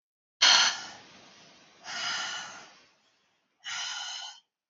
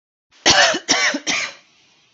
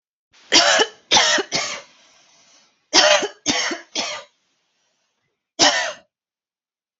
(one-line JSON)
{"exhalation_length": "4.7 s", "exhalation_amplitude": 13432, "exhalation_signal_mean_std_ratio": 0.37, "cough_length": "2.1 s", "cough_amplitude": 31240, "cough_signal_mean_std_ratio": 0.51, "three_cough_length": "7.0 s", "three_cough_amplitude": 31492, "three_cough_signal_mean_std_ratio": 0.41, "survey_phase": "alpha (2021-03-01 to 2021-08-12)", "age": "18-44", "gender": "Female", "wearing_mask": "No", "symptom_cough_any": true, "smoker_status": "Ex-smoker", "respiratory_condition_asthma": false, "respiratory_condition_other": false, "recruitment_source": "REACT", "submission_delay": "1 day", "covid_test_result": "Negative", "covid_test_method": "RT-qPCR"}